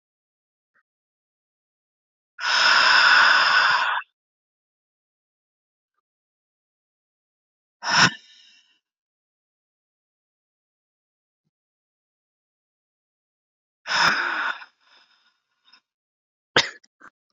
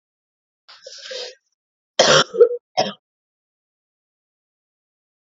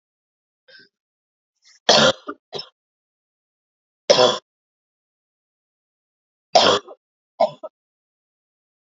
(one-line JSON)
{"exhalation_length": "17.3 s", "exhalation_amplitude": 26485, "exhalation_signal_mean_std_ratio": 0.3, "cough_length": "5.4 s", "cough_amplitude": 28988, "cough_signal_mean_std_ratio": 0.26, "three_cough_length": "9.0 s", "three_cough_amplitude": 32768, "three_cough_signal_mean_std_ratio": 0.24, "survey_phase": "beta (2021-08-13 to 2022-03-07)", "age": "18-44", "gender": "Female", "wearing_mask": "No", "symptom_cough_any": true, "symptom_runny_or_blocked_nose": true, "symptom_sore_throat": true, "symptom_fatigue": true, "symptom_headache": true, "symptom_change_to_sense_of_smell_or_taste": true, "symptom_other": true, "symptom_onset": "4 days", "smoker_status": "Never smoked", "respiratory_condition_asthma": false, "respiratory_condition_other": false, "recruitment_source": "Test and Trace", "submission_delay": "2 days", "covid_test_result": "Positive", "covid_test_method": "RT-qPCR", "covid_ct_value": 22.3, "covid_ct_gene": "ORF1ab gene", "covid_ct_mean": 22.5, "covid_viral_load": "41000 copies/ml", "covid_viral_load_category": "Low viral load (10K-1M copies/ml)"}